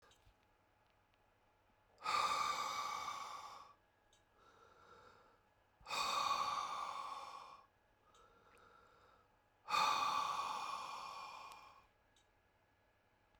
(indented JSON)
{
  "exhalation_length": "13.4 s",
  "exhalation_amplitude": 2037,
  "exhalation_signal_mean_std_ratio": 0.5,
  "survey_phase": "beta (2021-08-13 to 2022-03-07)",
  "age": "45-64",
  "gender": "Male",
  "wearing_mask": "No",
  "symptom_shortness_of_breath": true,
  "smoker_status": "Current smoker (1 to 10 cigarettes per day)",
  "respiratory_condition_asthma": true,
  "respiratory_condition_other": true,
  "recruitment_source": "REACT",
  "submission_delay": "2 days",
  "covid_test_result": "Negative",
  "covid_test_method": "RT-qPCR"
}